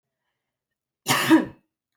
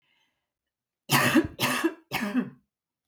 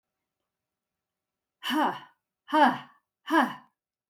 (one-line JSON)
{"cough_length": "2.0 s", "cough_amplitude": 17355, "cough_signal_mean_std_ratio": 0.33, "three_cough_length": "3.1 s", "three_cough_amplitude": 13394, "three_cough_signal_mean_std_ratio": 0.46, "exhalation_length": "4.1 s", "exhalation_amplitude": 11949, "exhalation_signal_mean_std_ratio": 0.34, "survey_phase": "beta (2021-08-13 to 2022-03-07)", "age": "45-64", "gender": "Female", "wearing_mask": "No", "symptom_cough_any": true, "smoker_status": "Never smoked", "respiratory_condition_asthma": true, "respiratory_condition_other": false, "recruitment_source": "REACT", "submission_delay": "1 day", "covid_test_result": "Negative", "covid_test_method": "RT-qPCR"}